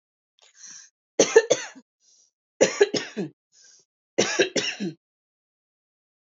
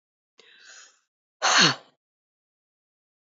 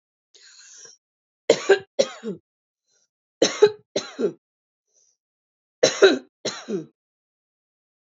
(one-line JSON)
{"cough_length": "6.4 s", "cough_amplitude": 26497, "cough_signal_mean_std_ratio": 0.3, "exhalation_length": "3.3 s", "exhalation_amplitude": 18576, "exhalation_signal_mean_std_ratio": 0.25, "three_cough_length": "8.2 s", "three_cough_amplitude": 32767, "three_cough_signal_mean_std_ratio": 0.27, "survey_phase": "alpha (2021-03-01 to 2021-08-12)", "age": "45-64", "gender": "Female", "wearing_mask": "No", "symptom_none": true, "smoker_status": "Never smoked", "respiratory_condition_asthma": true, "respiratory_condition_other": false, "recruitment_source": "REACT", "submission_delay": "2 days", "covid_test_result": "Negative", "covid_test_method": "RT-qPCR"}